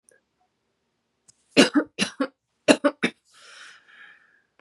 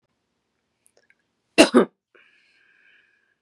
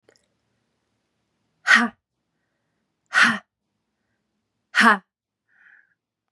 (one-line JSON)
{"three_cough_length": "4.6 s", "three_cough_amplitude": 32418, "three_cough_signal_mean_std_ratio": 0.25, "cough_length": "3.4 s", "cough_amplitude": 32767, "cough_signal_mean_std_ratio": 0.19, "exhalation_length": "6.3 s", "exhalation_amplitude": 29372, "exhalation_signal_mean_std_ratio": 0.24, "survey_phase": "beta (2021-08-13 to 2022-03-07)", "age": "18-44", "gender": "Female", "wearing_mask": "No", "symptom_cough_any": true, "symptom_new_continuous_cough": true, "symptom_runny_or_blocked_nose": true, "symptom_shortness_of_breath": true, "symptom_sore_throat": true, "symptom_fatigue": true, "symptom_change_to_sense_of_smell_or_taste": true, "symptom_onset": "4 days", "smoker_status": "Never smoked", "respiratory_condition_asthma": false, "respiratory_condition_other": false, "recruitment_source": "Test and Trace", "submission_delay": "2 days", "covid_test_result": "Positive", "covid_test_method": "RT-qPCR", "covid_ct_value": 19.7, "covid_ct_gene": "N gene", "covid_ct_mean": 20.1, "covid_viral_load": "250000 copies/ml", "covid_viral_load_category": "Low viral load (10K-1M copies/ml)"}